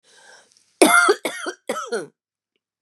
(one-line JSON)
{"cough_length": "2.8 s", "cough_amplitude": 32600, "cough_signal_mean_std_ratio": 0.38, "survey_phase": "beta (2021-08-13 to 2022-03-07)", "age": "45-64", "gender": "Female", "wearing_mask": "No", "symptom_none": true, "symptom_onset": "12 days", "smoker_status": "Ex-smoker", "respiratory_condition_asthma": false, "respiratory_condition_other": false, "recruitment_source": "REACT", "submission_delay": "4 days", "covid_test_result": "Negative", "covid_test_method": "RT-qPCR", "influenza_a_test_result": "Negative", "influenza_b_test_result": "Negative"}